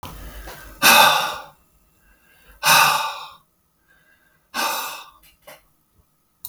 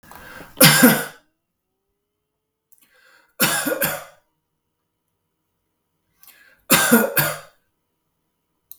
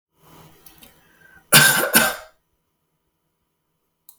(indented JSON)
{
  "exhalation_length": "6.5 s",
  "exhalation_amplitude": 32768,
  "exhalation_signal_mean_std_ratio": 0.37,
  "three_cough_length": "8.8 s",
  "three_cough_amplitude": 32768,
  "three_cough_signal_mean_std_ratio": 0.31,
  "cough_length": "4.2 s",
  "cough_amplitude": 32768,
  "cough_signal_mean_std_ratio": 0.29,
  "survey_phase": "beta (2021-08-13 to 2022-03-07)",
  "age": "45-64",
  "gender": "Male",
  "wearing_mask": "No",
  "symptom_none": true,
  "smoker_status": "Never smoked",
  "respiratory_condition_asthma": false,
  "respiratory_condition_other": false,
  "recruitment_source": "REACT",
  "submission_delay": "0 days",
  "covid_test_result": "Negative",
  "covid_test_method": "RT-qPCR",
  "influenza_a_test_result": "Negative",
  "influenza_b_test_result": "Negative"
}